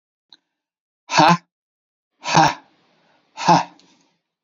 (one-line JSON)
{"exhalation_length": "4.4 s", "exhalation_amplitude": 28859, "exhalation_signal_mean_std_ratio": 0.31, "survey_phase": "beta (2021-08-13 to 2022-03-07)", "age": "45-64", "gender": "Male", "wearing_mask": "No", "symptom_none": true, "smoker_status": "Ex-smoker", "respiratory_condition_asthma": false, "respiratory_condition_other": false, "recruitment_source": "REACT", "submission_delay": "2 days", "covid_test_result": "Negative", "covid_test_method": "RT-qPCR", "influenza_a_test_result": "Negative", "influenza_b_test_result": "Negative"}